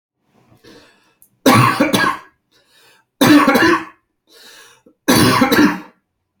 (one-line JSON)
{"three_cough_length": "6.4 s", "three_cough_amplitude": 32092, "three_cough_signal_mean_std_ratio": 0.47, "survey_phase": "beta (2021-08-13 to 2022-03-07)", "age": "18-44", "gender": "Male", "wearing_mask": "No", "symptom_none": true, "smoker_status": "Never smoked", "respiratory_condition_asthma": false, "respiratory_condition_other": false, "recruitment_source": "REACT", "submission_delay": "1 day", "covid_test_result": "Negative", "covid_test_method": "RT-qPCR"}